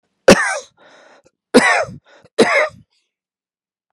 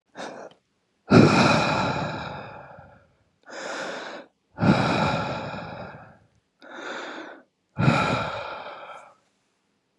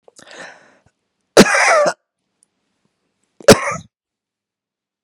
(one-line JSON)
{"three_cough_length": "3.9 s", "three_cough_amplitude": 32768, "three_cough_signal_mean_std_ratio": 0.35, "exhalation_length": "10.0 s", "exhalation_amplitude": 27266, "exhalation_signal_mean_std_ratio": 0.46, "cough_length": "5.0 s", "cough_amplitude": 32768, "cough_signal_mean_std_ratio": 0.28, "survey_phase": "beta (2021-08-13 to 2022-03-07)", "age": "45-64", "gender": "Male", "wearing_mask": "No", "symptom_cough_any": true, "symptom_runny_or_blocked_nose": true, "symptom_sore_throat": true, "symptom_fatigue": true, "symptom_headache": true, "symptom_change_to_sense_of_smell_or_taste": true, "symptom_onset": "4 days", "smoker_status": "Ex-smoker", "respiratory_condition_asthma": false, "respiratory_condition_other": false, "recruitment_source": "Test and Trace", "submission_delay": "1 day", "covid_test_result": "Positive", "covid_test_method": "RT-qPCR", "covid_ct_value": 19.9, "covid_ct_gene": "N gene", "covid_ct_mean": 20.0, "covid_viral_load": "280000 copies/ml", "covid_viral_load_category": "Low viral load (10K-1M copies/ml)"}